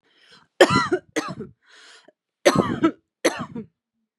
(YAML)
cough_length: 4.2 s
cough_amplitude: 31208
cough_signal_mean_std_ratio: 0.36
survey_phase: beta (2021-08-13 to 2022-03-07)
age: 18-44
gender: Female
wearing_mask: 'No'
symptom_none: true
smoker_status: Ex-smoker
respiratory_condition_asthma: false
respiratory_condition_other: false
recruitment_source: REACT
submission_delay: 6 days
covid_test_result: Negative
covid_test_method: RT-qPCR
influenza_a_test_result: Negative
influenza_b_test_result: Negative